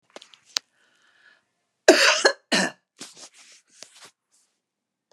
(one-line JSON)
{"cough_length": "5.1 s", "cough_amplitude": 32767, "cough_signal_mean_std_ratio": 0.26, "survey_phase": "beta (2021-08-13 to 2022-03-07)", "age": "65+", "gender": "Female", "wearing_mask": "No", "symptom_none": true, "smoker_status": "Ex-smoker", "respiratory_condition_asthma": false, "respiratory_condition_other": true, "recruitment_source": "REACT", "submission_delay": "3 days", "covid_test_result": "Negative", "covid_test_method": "RT-qPCR"}